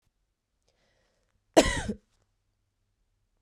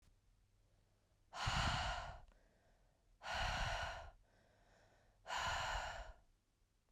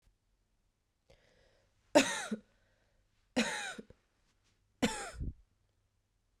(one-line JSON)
{"cough_length": "3.4 s", "cough_amplitude": 20860, "cough_signal_mean_std_ratio": 0.19, "exhalation_length": "6.9 s", "exhalation_amplitude": 1643, "exhalation_signal_mean_std_ratio": 0.53, "three_cough_length": "6.4 s", "three_cough_amplitude": 10460, "three_cough_signal_mean_std_ratio": 0.27, "survey_phase": "beta (2021-08-13 to 2022-03-07)", "age": "18-44", "gender": "Female", "wearing_mask": "No", "symptom_cough_any": true, "symptom_runny_or_blocked_nose": true, "symptom_shortness_of_breath": true, "symptom_fatigue": true, "symptom_change_to_sense_of_smell_or_taste": true, "symptom_onset": "5 days", "smoker_status": "Ex-smoker", "respiratory_condition_asthma": false, "respiratory_condition_other": false, "recruitment_source": "Test and Trace", "submission_delay": "2 days", "covid_test_result": "Positive", "covid_test_method": "RT-qPCR", "covid_ct_value": 21.7, "covid_ct_gene": "ORF1ab gene", "covid_ct_mean": 22.0, "covid_viral_load": "63000 copies/ml", "covid_viral_load_category": "Low viral load (10K-1M copies/ml)"}